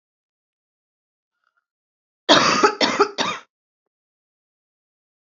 {"cough_length": "5.3 s", "cough_amplitude": 32767, "cough_signal_mean_std_ratio": 0.29, "survey_phase": "beta (2021-08-13 to 2022-03-07)", "age": "18-44", "gender": "Female", "wearing_mask": "No", "symptom_cough_any": true, "symptom_sore_throat": true, "symptom_fatigue": true, "symptom_onset": "1 day", "smoker_status": "Never smoked", "respiratory_condition_asthma": false, "respiratory_condition_other": false, "recruitment_source": "Test and Trace", "submission_delay": "0 days", "covid_test_result": "Negative", "covid_test_method": "RT-qPCR"}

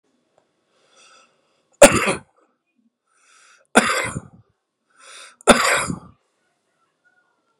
{"three_cough_length": "7.6 s", "three_cough_amplitude": 32768, "three_cough_signal_mean_std_ratio": 0.25, "survey_phase": "beta (2021-08-13 to 2022-03-07)", "age": "45-64", "gender": "Male", "wearing_mask": "No", "symptom_cough_any": true, "symptom_new_continuous_cough": true, "symptom_shortness_of_breath": true, "symptom_sore_throat": true, "symptom_headache": true, "symptom_onset": "4 days", "smoker_status": "Never smoked", "respiratory_condition_asthma": false, "respiratory_condition_other": false, "recruitment_source": "REACT", "submission_delay": "1 day", "covid_test_result": "Negative", "covid_test_method": "RT-qPCR"}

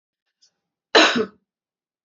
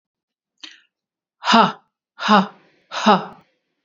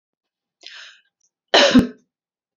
{"cough_length": "2.0 s", "cough_amplitude": 30108, "cough_signal_mean_std_ratio": 0.28, "exhalation_length": "3.8 s", "exhalation_amplitude": 28424, "exhalation_signal_mean_std_ratio": 0.33, "three_cough_length": "2.6 s", "three_cough_amplitude": 29666, "three_cough_signal_mean_std_ratio": 0.29, "survey_phase": "beta (2021-08-13 to 2022-03-07)", "age": "45-64", "gender": "Female", "wearing_mask": "No", "symptom_none": true, "smoker_status": "Ex-smoker", "respiratory_condition_asthma": false, "respiratory_condition_other": false, "recruitment_source": "REACT", "submission_delay": "2 days", "covid_test_result": "Negative", "covid_test_method": "RT-qPCR", "influenza_a_test_result": "Negative", "influenza_b_test_result": "Negative"}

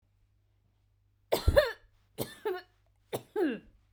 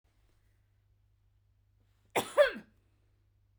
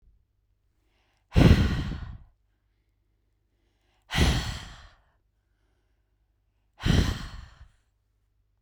{"three_cough_length": "3.9 s", "three_cough_amplitude": 12723, "three_cough_signal_mean_std_ratio": 0.33, "cough_length": "3.6 s", "cough_amplitude": 7550, "cough_signal_mean_std_ratio": 0.21, "exhalation_length": "8.6 s", "exhalation_amplitude": 19829, "exhalation_signal_mean_std_ratio": 0.3, "survey_phase": "beta (2021-08-13 to 2022-03-07)", "age": "18-44", "gender": "Female", "wearing_mask": "No", "symptom_none": true, "smoker_status": "Ex-smoker", "respiratory_condition_asthma": false, "respiratory_condition_other": false, "recruitment_source": "REACT", "submission_delay": "1 day", "covid_test_result": "Negative", "covid_test_method": "RT-qPCR"}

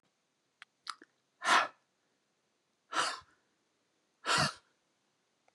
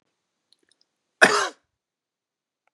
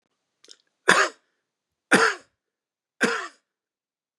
{"exhalation_length": "5.5 s", "exhalation_amplitude": 6975, "exhalation_signal_mean_std_ratio": 0.28, "cough_length": "2.7 s", "cough_amplitude": 32767, "cough_signal_mean_std_ratio": 0.21, "three_cough_length": "4.2 s", "three_cough_amplitude": 32767, "three_cough_signal_mean_std_ratio": 0.28, "survey_phase": "beta (2021-08-13 to 2022-03-07)", "age": "45-64", "gender": "Male", "wearing_mask": "No", "symptom_none": true, "smoker_status": "Ex-smoker", "respiratory_condition_asthma": false, "respiratory_condition_other": false, "recruitment_source": "REACT", "submission_delay": "3 days", "covid_test_result": "Negative", "covid_test_method": "RT-qPCR", "influenza_a_test_result": "Negative", "influenza_b_test_result": "Negative"}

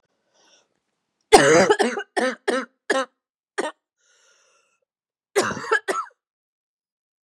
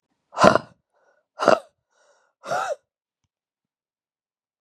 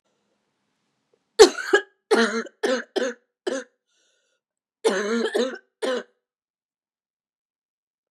{"cough_length": "7.3 s", "cough_amplitude": 32768, "cough_signal_mean_std_ratio": 0.34, "exhalation_length": "4.6 s", "exhalation_amplitude": 32768, "exhalation_signal_mean_std_ratio": 0.23, "three_cough_length": "8.1 s", "three_cough_amplitude": 32767, "three_cough_signal_mean_std_ratio": 0.32, "survey_phase": "beta (2021-08-13 to 2022-03-07)", "age": "18-44", "gender": "Female", "wearing_mask": "No", "symptom_cough_any": true, "symptom_new_continuous_cough": true, "symptom_runny_or_blocked_nose": true, "symptom_shortness_of_breath": true, "symptom_sore_throat": true, "symptom_abdominal_pain": true, "symptom_diarrhoea": true, "symptom_fatigue": true, "symptom_fever_high_temperature": true, "symptom_headache": true, "symptom_change_to_sense_of_smell_or_taste": true, "symptom_loss_of_taste": true, "symptom_onset": "4 days", "smoker_status": "Never smoked", "respiratory_condition_asthma": true, "respiratory_condition_other": false, "recruitment_source": "Test and Trace", "submission_delay": "2 days", "covid_test_result": "Positive", "covid_test_method": "ePCR"}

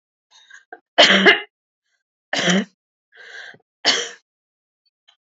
{"three_cough_length": "5.4 s", "three_cough_amplitude": 29435, "three_cough_signal_mean_std_ratio": 0.32, "survey_phase": "alpha (2021-03-01 to 2021-08-12)", "age": "65+", "gender": "Female", "wearing_mask": "No", "symptom_none": true, "smoker_status": "Ex-smoker", "respiratory_condition_asthma": false, "respiratory_condition_other": false, "recruitment_source": "REACT", "submission_delay": "3 days", "covid_test_result": "Negative", "covid_test_method": "RT-qPCR"}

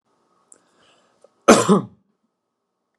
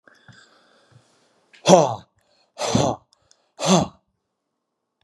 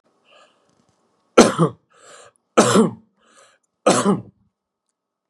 {"cough_length": "3.0 s", "cough_amplitude": 32768, "cough_signal_mean_std_ratio": 0.24, "exhalation_length": "5.0 s", "exhalation_amplitude": 32753, "exhalation_signal_mean_std_ratio": 0.3, "three_cough_length": "5.3 s", "three_cough_amplitude": 32768, "three_cough_signal_mean_std_ratio": 0.31, "survey_phase": "beta (2021-08-13 to 2022-03-07)", "age": "45-64", "gender": "Male", "wearing_mask": "No", "symptom_none": true, "smoker_status": "Never smoked", "respiratory_condition_asthma": false, "respiratory_condition_other": false, "recruitment_source": "REACT", "submission_delay": "2 days", "covid_test_result": "Negative", "covid_test_method": "RT-qPCR", "influenza_a_test_result": "Negative", "influenza_b_test_result": "Negative"}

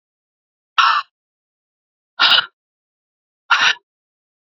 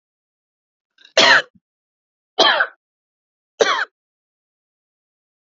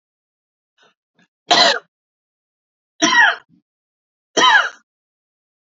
{"exhalation_length": "4.5 s", "exhalation_amplitude": 29848, "exhalation_signal_mean_std_ratio": 0.31, "cough_length": "5.5 s", "cough_amplitude": 29954, "cough_signal_mean_std_ratio": 0.28, "three_cough_length": "5.7 s", "three_cough_amplitude": 30418, "three_cough_signal_mean_std_ratio": 0.32, "survey_phase": "beta (2021-08-13 to 2022-03-07)", "age": "18-44", "gender": "Female", "wearing_mask": "No", "symptom_cough_any": true, "symptom_runny_or_blocked_nose": true, "symptom_shortness_of_breath": true, "symptom_sore_throat": true, "symptom_fatigue": true, "symptom_headache": true, "smoker_status": "Ex-smoker", "respiratory_condition_asthma": false, "respiratory_condition_other": false, "recruitment_source": "Test and Trace", "submission_delay": "1 day", "covid_test_result": "Positive", "covid_test_method": "LFT"}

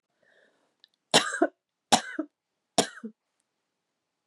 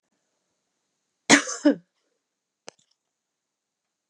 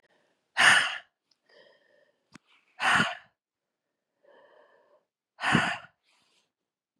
{"three_cough_length": "4.3 s", "three_cough_amplitude": 19875, "three_cough_signal_mean_std_ratio": 0.24, "cough_length": "4.1 s", "cough_amplitude": 30361, "cough_signal_mean_std_ratio": 0.19, "exhalation_length": "7.0 s", "exhalation_amplitude": 15467, "exhalation_signal_mean_std_ratio": 0.29, "survey_phase": "beta (2021-08-13 to 2022-03-07)", "age": "45-64", "gender": "Female", "wearing_mask": "No", "symptom_sore_throat": true, "symptom_onset": "5 days", "smoker_status": "Ex-smoker", "respiratory_condition_asthma": false, "respiratory_condition_other": false, "recruitment_source": "Test and Trace", "submission_delay": "2 days", "covid_test_result": "Positive", "covid_test_method": "RT-qPCR", "covid_ct_value": 30.8, "covid_ct_gene": "N gene"}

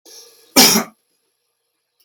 {"cough_length": "2.0 s", "cough_amplitude": 32768, "cough_signal_mean_std_ratio": 0.3, "survey_phase": "beta (2021-08-13 to 2022-03-07)", "age": "45-64", "gender": "Male", "wearing_mask": "No", "symptom_none": true, "smoker_status": "Ex-smoker", "respiratory_condition_asthma": false, "respiratory_condition_other": false, "recruitment_source": "REACT", "submission_delay": "1 day", "covid_test_result": "Negative", "covid_test_method": "RT-qPCR"}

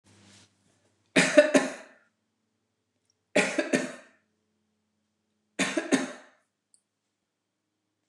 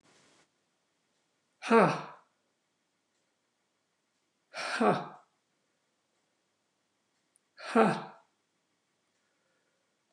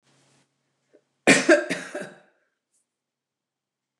{"three_cough_length": "8.1 s", "three_cough_amplitude": 20062, "three_cough_signal_mean_std_ratio": 0.28, "exhalation_length": "10.1 s", "exhalation_amplitude": 10543, "exhalation_signal_mean_std_ratio": 0.23, "cough_length": "4.0 s", "cough_amplitude": 26219, "cough_signal_mean_std_ratio": 0.25, "survey_phase": "beta (2021-08-13 to 2022-03-07)", "age": "65+", "gender": "Female", "wearing_mask": "No", "symptom_none": true, "smoker_status": "Never smoked", "respiratory_condition_asthma": false, "respiratory_condition_other": false, "recruitment_source": "REACT", "submission_delay": "1 day", "covid_test_result": "Negative", "covid_test_method": "RT-qPCR"}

